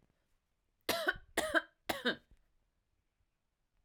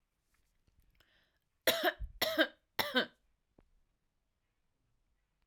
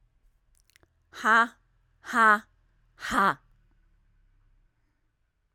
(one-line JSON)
{"three_cough_length": "3.8 s", "three_cough_amplitude": 4790, "three_cough_signal_mean_std_ratio": 0.32, "cough_length": "5.5 s", "cough_amplitude": 6635, "cough_signal_mean_std_ratio": 0.28, "exhalation_length": "5.5 s", "exhalation_amplitude": 13597, "exhalation_signal_mean_std_ratio": 0.28, "survey_phase": "alpha (2021-03-01 to 2021-08-12)", "age": "18-44", "gender": "Female", "wearing_mask": "No", "symptom_none": true, "symptom_onset": "2 days", "smoker_status": "Never smoked", "respiratory_condition_asthma": false, "respiratory_condition_other": false, "recruitment_source": "Test and Trace", "submission_delay": "2 days", "covid_test_result": "Positive", "covid_test_method": "RT-qPCR"}